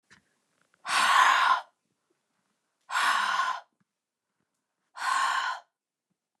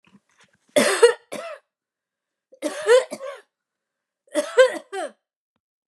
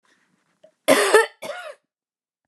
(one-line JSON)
{"exhalation_length": "6.4 s", "exhalation_amplitude": 12324, "exhalation_signal_mean_std_ratio": 0.45, "three_cough_length": "5.9 s", "three_cough_amplitude": 27298, "three_cough_signal_mean_std_ratio": 0.33, "cough_length": "2.5 s", "cough_amplitude": 29928, "cough_signal_mean_std_ratio": 0.33, "survey_phase": "beta (2021-08-13 to 2022-03-07)", "age": "45-64", "gender": "Female", "wearing_mask": "No", "symptom_none": true, "smoker_status": "Ex-smoker", "respiratory_condition_asthma": false, "respiratory_condition_other": false, "recruitment_source": "REACT", "submission_delay": "1 day", "covid_test_result": "Negative", "covid_test_method": "RT-qPCR", "influenza_a_test_result": "Negative", "influenza_b_test_result": "Negative"}